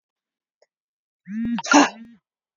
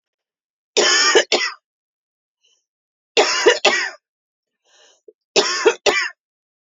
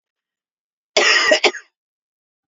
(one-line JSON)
{"exhalation_length": "2.6 s", "exhalation_amplitude": 28602, "exhalation_signal_mean_std_ratio": 0.31, "three_cough_length": "6.7 s", "three_cough_amplitude": 32767, "three_cough_signal_mean_std_ratio": 0.41, "cough_length": "2.5 s", "cough_amplitude": 29167, "cough_signal_mean_std_ratio": 0.37, "survey_phase": "beta (2021-08-13 to 2022-03-07)", "age": "45-64", "gender": "Female", "wearing_mask": "No", "symptom_cough_any": true, "symptom_onset": "12 days", "smoker_status": "Never smoked", "respiratory_condition_asthma": true, "respiratory_condition_other": false, "recruitment_source": "REACT", "submission_delay": "1 day", "covid_test_result": "Negative", "covid_test_method": "RT-qPCR", "influenza_a_test_result": "Unknown/Void", "influenza_b_test_result": "Unknown/Void"}